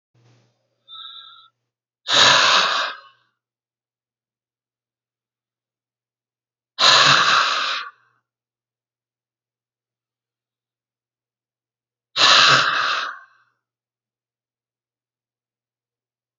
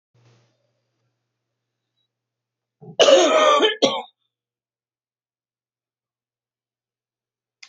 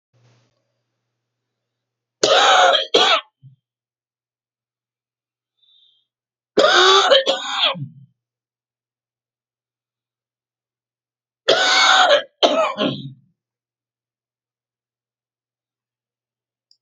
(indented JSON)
{
  "exhalation_length": "16.4 s",
  "exhalation_amplitude": 32767,
  "exhalation_signal_mean_std_ratio": 0.32,
  "cough_length": "7.7 s",
  "cough_amplitude": 28864,
  "cough_signal_mean_std_ratio": 0.27,
  "three_cough_length": "16.8 s",
  "three_cough_amplitude": 32768,
  "three_cough_signal_mean_std_ratio": 0.35,
  "survey_phase": "alpha (2021-03-01 to 2021-08-12)",
  "age": "65+",
  "gender": "Male",
  "wearing_mask": "No",
  "symptom_none": true,
  "smoker_status": "Never smoked",
  "respiratory_condition_asthma": false,
  "respiratory_condition_other": false,
  "recruitment_source": "REACT",
  "submission_delay": "2 days",
  "covid_test_result": "Negative",
  "covid_test_method": "RT-qPCR"
}